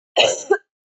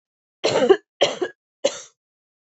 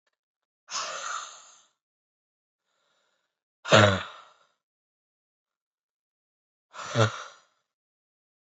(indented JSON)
{
  "cough_length": "0.9 s",
  "cough_amplitude": 28129,
  "cough_signal_mean_std_ratio": 0.47,
  "three_cough_length": "2.5 s",
  "three_cough_amplitude": 26836,
  "three_cough_signal_mean_std_ratio": 0.36,
  "exhalation_length": "8.4 s",
  "exhalation_amplitude": 21336,
  "exhalation_signal_mean_std_ratio": 0.23,
  "survey_phase": "alpha (2021-03-01 to 2021-08-12)",
  "age": "18-44",
  "gender": "Female",
  "wearing_mask": "No",
  "symptom_new_continuous_cough": true,
  "symptom_shortness_of_breath": true,
  "symptom_fatigue": true,
  "symptom_fever_high_temperature": true,
  "symptom_headache": true,
  "symptom_onset": "3 days",
  "smoker_status": "Never smoked",
  "respiratory_condition_asthma": true,
  "respiratory_condition_other": false,
  "recruitment_source": "Test and Trace",
  "submission_delay": "2 days",
  "covid_test_result": "Positive",
  "covid_test_method": "RT-qPCR",
  "covid_ct_value": 17.9,
  "covid_ct_gene": "ORF1ab gene",
  "covid_ct_mean": 18.5,
  "covid_viral_load": "880000 copies/ml",
  "covid_viral_load_category": "Low viral load (10K-1M copies/ml)"
}